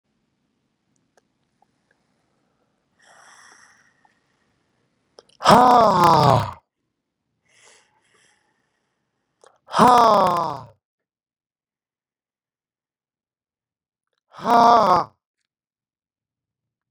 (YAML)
exhalation_length: 16.9 s
exhalation_amplitude: 32767
exhalation_signal_mean_std_ratio: 0.27
survey_phase: beta (2021-08-13 to 2022-03-07)
age: 65+
gender: Male
wearing_mask: 'No'
symptom_runny_or_blocked_nose: true
symptom_sore_throat: true
symptom_onset: 6 days
smoker_status: Never smoked
respiratory_condition_asthma: false
respiratory_condition_other: false
recruitment_source: Test and Trace
submission_delay: 2 days
covid_test_result: Positive
covid_test_method: RT-qPCR
covid_ct_value: 12.6
covid_ct_gene: ORF1ab gene
covid_ct_mean: 13.0
covid_viral_load: 56000000 copies/ml
covid_viral_load_category: High viral load (>1M copies/ml)